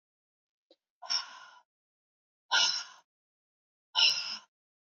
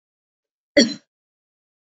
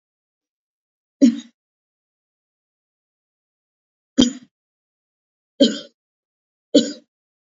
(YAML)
exhalation_length: 4.9 s
exhalation_amplitude: 8438
exhalation_signal_mean_std_ratio: 0.31
cough_length: 1.9 s
cough_amplitude: 27405
cough_signal_mean_std_ratio: 0.2
three_cough_length: 7.4 s
three_cough_amplitude: 27902
three_cough_signal_mean_std_ratio: 0.2
survey_phase: beta (2021-08-13 to 2022-03-07)
age: 65+
gender: Female
wearing_mask: 'No'
symptom_none: true
smoker_status: Ex-smoker
respiratory_condition_asthma: false
respiratory_condition_other: false
recruitment_source: REACT
submission_delay: 3 days
covid_test_result: Negative
covid_test_method: RT-qPCR
influenza_a_test_result: Negative
influenza_b_test_result: Negative